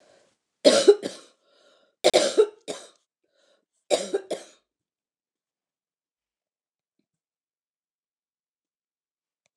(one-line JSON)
{"three_cough_length": "9.6 s", "three_cough_amplitude": 24735, "three_cough_signal_mean_std_ratio": 0.22, "survey_phase": "beta (2021-08-13 to 2022-03-07)", "age": "65+", "gender": "Female", "wearing_mask": "No", "symptom_cough_any": true, "symptom_runny_or_blocked_nose": true, "symptom_fatigue": true, "symptom_headache": true, "symptom_loss_of_taste": true, "symptom_onset": "4 days", "smoker_status": "Never smoked", "respiratory_condition_asthma": false, "respiratory_condition_other": false, "recruitment_source": "Test and Trace", "submission_delay": "2 days", "covid_test_result": "Positive", "covid_test_method": "RT-qPCR", "covid_ct_value": 20.3, "covid_ct_gene": "ORF1ab gene", "covid_ct_mean": 20.4, "covid_viral_load": "210000 copies/ml", "covid_viral_load_category": "Low viral load (10K-1M copies/ml)"}